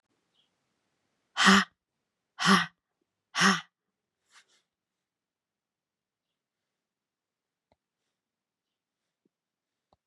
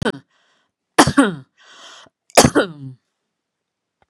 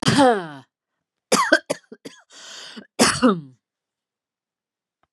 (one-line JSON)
{"exhalation_length": "10.1 s", "exhalation_amplitude": 18147, "exhalation_signal_mean_std_ratio": 0.2, "three_cough_length": "4.1 s", "three_cough_amplitude": 32768, "three_cough_signal_mean_std_ratio": 0.29, "cough_length": "5.1 s", "cough_amplitude": 30855, "cough_signal_mean_std_ratio": 0.36, "survey_phase": "beta (2021-08-13 to 2022-03-07)", "age": "45-64", "gender": "Female", "wearing_mask": "No", "symptom_none": true, "smoker_status": "Never smoked", "respiratory_condition_asthma": false, "respiratory_condition_other": false, "recruitment_source": "REACT", "submission_delay": "6 days", "covid_test_result": "Negative", "covid_test_method": "RT-qPCR", "influenza_a_test_result": "Negative", "influenza_b_test_result": "Negative"}